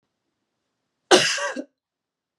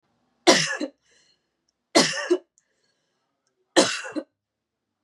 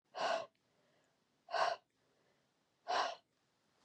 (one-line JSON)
{"cough_length": "2.4 s", "cough_amplitude": 32637, "cough_signal_mean_std_ratio": 0.28, "three_cough_length": "5.0 s", "three_cough_amplitude": 31165, "three_cough_signal_mean_std_ratio": 0.31, "exhalation_length": "3.8 s", "exhalation_amplitude": 2710, "exhalation_signal_mean_std_ratio": 0.37, "survey_phase": "beta (2021-08-13 to 2022-03-07)", "age": "18-44", "gender": "Female", "wearing_mask": "No", "symptom_cough_any": true, "symptom_runny_or_blocked_nose": true, "symptom_shortness_of_breath": true, "symptom_fatigue": true, "symptom_headache": true, "symptom_change_to_sense_of_smell_or_taste": true, "symptom_loss_of_taste": true, "symptom_onset": "3 days", "smoker_status": "Never smoked", "respiratory_condition_asthma": false, "respiratory_condition_other": false, "recruitment_source": "Test and Trace", "submission_delay": "3 days", "covid_test_result": "Positive", "covid_test_method": "RT-qPCR", "covid_ct_value": 21.4, "covid_ct_gene": "ORF1ab gene"}